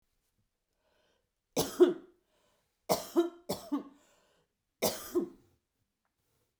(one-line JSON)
{"three_cough_length": "6.6 s", "three_cough_amplitude": 8677, "three_cough_signal_mean_std_ratio": 0.28, "survey_phase": "beta (2021-08-13 to 2022-03-07)", "age": "45-64", "gender": "Female", "wearing_mask": "No", "symptom_none": true, "smoker_status": "Never smoked", "respiratory_condition_asthma": false, "respiratory_condition_other": false, "recruitment_source": "REACT", "submission_delay": "2 days", "covid_test_result": "Negative", "covid_test_method": "RT-qPCR"}